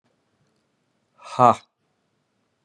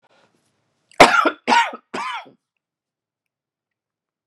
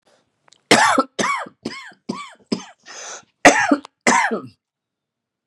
{
  "exhalation_length": "2.6 s",
  "exhalation_amplitude": 26882,
  "exhalation_signal_mean_std_ratio": 0.17,
  "three_cough_length": "4.3 s",
  "three_cough_amplitude": 32768,
  "three_cough_signal_mean_std_ratio": 0.28,
  "cough_length": "5.5 s",
  "cough_amplitude": 32768,
  "cough_signal_mean_std_ratio": 0.38,
  "survey_phase": "beta (2021-08-13 to 2022-03-07)",
  "age": "65+",
  "gender": "Male",
  "wearing_mask": "No",
  "symptom_new_continuous_cough": true,
  "symptom_runny_or_blocked_nose": true,
  "symptom_sore_throat": true,
  "symptom_diarrhoea": true,
  "symptom_fatigue": true,
  "symptom_onset": "2 days",
  "smoker_status": "Never smoked",
  "respiratory_condition_asthma": false,
  "respiratory_condition_other": false,
  "recruitment_source": "Test and Trace",
  "submission_delay": "2 days",
  "covid_test_result": "Positive",
  "covid_test_method": "RT-qPCR",
  "covid_ct_value": 23.0,
  "covid_ct_gene": "ORF1ab gene",
  "covid_ct_mean": 23.5,
  "covid_viral_load": "20000 copies/ml",
  "covid_viral_load_category": "Low viral load (10K-1M copies/ml)"
}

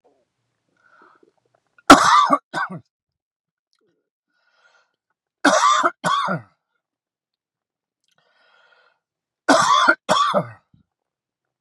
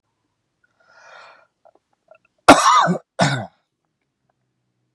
{
  "three_cough_length": "11.6 s",
  "three_cough_amplitude": 32768,
  "three_cough_signal_mean_std_ratio": 0.32,
  "cough_length": "4.9 s",
  "cough_amplitude": 32768,
  "cough_signal_mean_std_ratio": 0.27,
  "survey_phase": "beta (2021-08-13 to 2022-03-07)",
  "age": "45-64",
  "gender": "Male",
  "wearing_mask": "No",
  "symptom_none": true,
  "smoker_status": "Ex-smoker",
  "respiratory_condition_asthma": false,
  "respiratory_condition_other": false,
  "recruitment_source": "REACT",
  "submission_delay": "5 days",
  "covid_test_result": "Negative",
  "covid_test_method": "RT-qPCR",
  "influenza_a_test_result": "Unknown/Void",
  "influenza_b_test_result": "Unknown/Void"
}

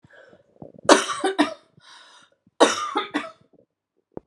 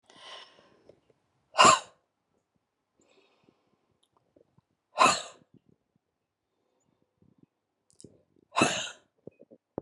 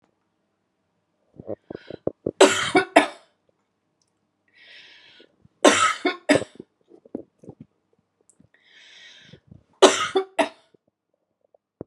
{
  "cough_length": "4.3 s",
  "cough_amplitude": 32767,
  "cough_signal_mean_std_ratio": 0.33,
  "exhalation_length": "9.8 s",
  "exhalation_amplitude": 18757,
  "exhalation_signal_mean_std_ratio": 0.2,
  "three_cough_length": "11.9 s",
  "three_cough_amplitude": 32767,
  "three_cough_signal_mean_std_ratio": 0.26,
  "survey_phase": "beta (2021-08-13 to 2022-03-07)",
  "age": "45-64",
  "gender": "Female",
  "wearing_mask": "No",
  "symptom_none": true,
  "smoker_status": "Never smoked",
  "respiratory_condition_asthma": true,
  "respiratory_condition_other": false,
  "recruitment_source": "REACT",
  "submission_delay": "1 day",
  "covid_test_result": "Negative",
  "covid_test_method": "RT-qPCR"
}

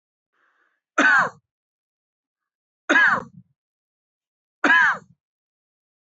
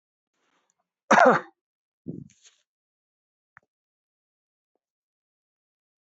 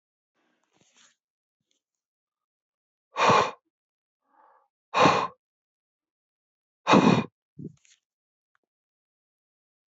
{
  "three_cough_length": "6.1 s",
  "three_cough_amplitude": 20790,
  "three_cough_signal_mean_std_ratio": 0.32,
  "cough_length": "6.1 s",
  "cough_amplitude": 20293,
  "cough_signal_mean_std_ratio": 0.17,
  "exhalation_length": "10.0 s",
  "exhalation_amplitude": 18319,
  "exhalation_signal_mean_std_ratio": 0.25,
  "survey_phase": "beta (2021-08-13 to 2022-03-07)",
  "age": "45-64",
  "gender": "Male",
  "wearing_mask": "No",
  "symptom_none": true,
  "smoker_status": "Ex-smoker",
  "respiratory_condition_asthma": false,
  "respiratory_condition_other": false,
  "recruitment_source": "REACT",
  "submission_delay": "3 days",
  "covid_test_result": "Negative",
  "covid_test_method": "RT-qPCR",
  "influenza_a_test_result": "Negative",
  "influenza_b_test_result": "Negative"
}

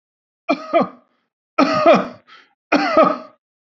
{
  "three_cough_length": "3.7 s",
  "three_cough_amplitude": 28289,
  "three_cough_signal_mean_std_ratio": 0.45,
  "survey_phase": "beta (2021-08-13 to 2022-03-07)",
  "age": "45-64",
  "gender": "Male",
  "wearing_mask": "No",
  "symptom_none": true,
  "smoker_status": "Never smoked",
  "respiratory_condition_asthma": false,
  "respiratory_condition_other": false,
  "recruitment_source": "REACT",
  "submission_delay": "1 day",
  "covid_test_result": "Negative",
  "covid_test_method": "RT-qPCR"
}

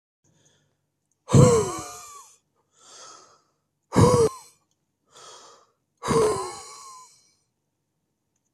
{
  "exhalation_length": "8.5 s",
  "exhalation_amplitude": 22950,
  "exhalation_signal_mean_std_ratio": 0.31,
  "survey_phase": "beta (2021-08-13 to 2022-03-07)",
  "age": "45-64",
  "gender": "Male",
  "wearing_mask": "No",
  "symptom_none": true,
  "smoker_status": "Never smoked",
  "respiratory_condition_asthma": false,
  "respiratory_condition_other": false,
  "recruitment_source": "REACT",
  "submission_delay": "3 days",
  "covid_test_result": "Negative",
  "covid_test_method": "RT-qPCR",
  "influenza_a_test_result": "Unknown/Void",
  "influenza_b_test_result": "Unknown/Void"
}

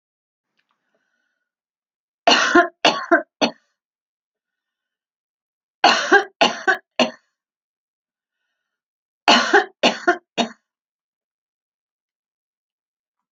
{
  "three_cough_length": "13.3 s",
  "three_cough_amplitude": 32768,
  "three_cough_signal_mean_std_ratio": 0.29,
  "survey_phase": "alpha (2021-03-01 to 2021-08-12)",
  "age": "65+",
  "gender": "Female",
  "wearing_mask": "No",
  "symptom_none": true,
  "smoker_status": "Ex-smoker",
  "respiratory_condition_asthma": false,
  "respiratory_condition_other": false,
  "recruitment_source": "REACT",
  "submission_delay": "2 days",
  "covid_test_result": "Negative",
  "covid_test_method": "RT-qPCR"
}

